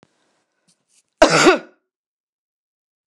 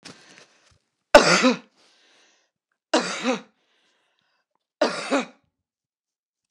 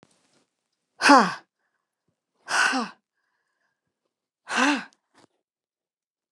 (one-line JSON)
{"cough_length": "3.1 s", "cough_amplitude": 29204, "cough_signal_mean_std_ratio": 0.26, "three_cough_length": "6.5 s", "three_cough_amplitude": 29204, "three_cough_signal_mean_std_ratio": 0.27, "exhalation_length": "6.3 s", "exhalation_amplitude": 27194, "exhalation_signal_mean_std_ratio": 0.27, "survey_phase": "beta (2021-08-13 to 2022-03-07)", "age": "45-64", "gender": "Female", "wearing_mask": "No", "symptom_none": true, "symptom_onset": "12 days", "smoker_status": "Prefer not to say", "respiratory_condition_asthma": false, "respiratory_condition_other": false, "recruitment_source": "REACT", "submission_delay": "1 day", "covid_test_result": "Negative", "covid_test_method": "RT-qPCR"}